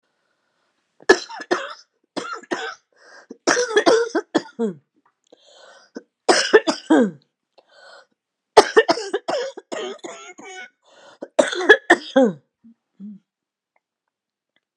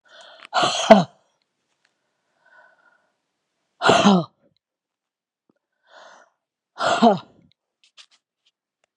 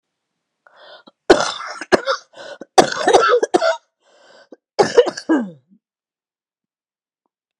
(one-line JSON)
{"three_cough_length": "14.8 s", "three_cough_amplitude": 32768, "three_cough_signal_mean_std_ratio": 0.33, "exhalation_length": "9.0 s", "exhalation_amplitude": 32768, "exhalation_signal_mean_std_ratio": 0.27, "cough_length": "7.6 s", "cough_amplitude": 32768, "cough_signal_mean_std_ratio": 0.35, "survey_phase": "beta (2021-08-13 to 2022-03-07)", "age": "65+", "gender": "Female", "wearing_mask": "No", "symptom_new_continuous_cough": true, "symptom_runny_or_blocked_nose": true, "symptom_sore_throat": true, "symptom_onset": "4 days", "smoker_status": "Ex-smoker", "respiratory_condition_asthma": false, "respiratory_condition_other": false, "recruitment_source": "Test and Trace", "submission_delay": "1 day", "covid_test_result": "Positive", "covid_test_method": "RT-qPCR", "covid_ct_value": 22.4, "covid_ct_gene": "ORF1ab gene"}